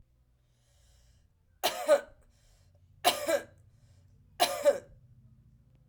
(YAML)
three_cough_length: 5.9 s
three_cough_amplitude: 10997
three_cough_signal_mean_std_ratio: 0.31
survey_phase: alpha (2021-03-01 to 2021-08-12)
age: 45-64
gender: Female
wearing_mask: 'No'
symptom_fatigue: true
symptom_headache: true
symptom_change_to_sense_of_smell_or_taste: true
symptom_loss_of_taste: true
smoker_status: Ex-smoker
respiratory_condition_asthma: false
respiratory_condition_other: false
recruitment_source: Test and Trace
submission_delay: 2 days
covid_test_result: Positive
covid_test_method: RT-qPCR
covid_ct_value: 22.6
covid_ct_gene: ORF1ab gene